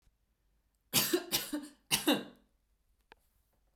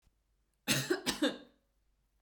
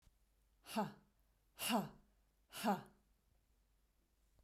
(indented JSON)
{
  "three_cough_length": "3.8 s",
  "three_cough_amplitude": 6657,
  "three_cough_signal_mean_std_ratio": 0.36,
  "cough_length": "2.2 s",
  "cough_amplitude": 4798,
  "cough_signal_mean_std_ratio": 0.39,
  "exhalation_length": "4.4 s",
  "exhalation_amplitude": 1804,
  "exhalation_signal_mean_std_ratio": 0.33,
  "survey_phase": "beta (2021-08-13 to 2022-03-07)",
  "age": "18-44",
  "gender": "Female",
  "wearing_mask": "No",
  "symptom_none": true,
  "smoker_status": "Never smoked",
  "respiratory_condition_asthma": false,
  "respiratory_condition_other": false,
  "recruitment_source": "REACT",
  "submission_delay": "2 days",
  "covid_test_result": "Negative",
  "covid_test_method": "RT-qPCR",
  "influenza_a_test_result": "Negative",
  "influenza_b_test_result": "Negative"
}